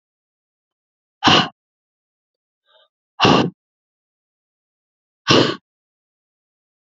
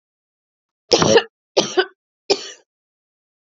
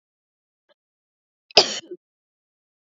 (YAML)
exhalation_length: 6.8 s
exhalation_amplitude: 32397
exhalation_signal_mean_std_ratio: 0.26
three_cough_length: 3.5 s
three_cough_amplitude: 32768
three_cough_signal_mean_std_ratio: 0.31
cough_length: 2.8 s
cough_amplitude: 28747
cough_signal_mean_std_ratio: 0.16
survey_phase: beta (2021-08-13 to 2022-03-07)
age: 18-44
gender: Female
wearing_mask: 'No'
symptom_cough_any: true
symptom_runny_or_blocked_nose: true
symptom_sore_throat: true
smoker_status: Never smoked
respiratory_condition_asthma: false
respiratory_condition_other: false
recruitment_source: Test and Trace
submission_delay: 2 days
covid_test_result: Positive
covid_test_method: RT-qPCR
covid_ct_value: 29.0
covid_ct_gene: ORF1ab gene
covid_ct_mean: 29.9
covid_viral_load: 160 copies/ml
covid_viral_load_category: Minimal viral load (< 10K copies/ml)